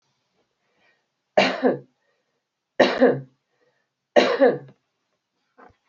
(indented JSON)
{
  "three_cough_length": "5.9 s",
  "three_cough_amplitude": 26318,
  "three_cough_signal_mean_std_ratio": 0.32,
  "survey_phase": "beta (2021-08-13 to 2022-03-07)",
  "age": "65+",
  "gender": "Female",
  "wearing_mask": "No",
  "symptom_none": true,
  "smoker_status": "Current smoker (e-cigarettes or vapes only)",
  "respiratory_condition_asthma": false,
  "respiratory_condition_other": false,
  "recruitment_source": "REACT",
  "submission_delay": "2 days",
  "covid_test_result": "Negative",
  "covid_test_method": "RT-qPCR"
}